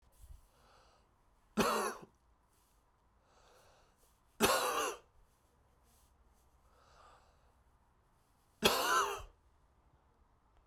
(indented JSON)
{
  "three_cough_length": "10.7 s",
  "three_cough_amplitude": 7063,
  "three_cough_signal_mean_std_ratio": 0.32,
  "survey_phase": "beta (2021-08-13 to 2022-03-07)",
  "age": "45-64",
  "gender": "Male",
  "wearing_mask": "No",
  "symptom_cough_any": true,
  "symptom_runny_or_blocked_nose": true,
  "symptom_shortness_of_breath": true,
  "symptom_fatigue": true,
  "symptom_headache": true,
  "symptom_onset": "3 days",
  "smoker_status": "Never smoked",
  "respiratory_condition_asthma": true,
  "respiratory_condition_other": false,
  "recruitment_source": "Test and Trace",
  "submission_delay": "2 days",
  "covid_test_result": "Positive",
  "covid_test_method": "RT-qPCR"
}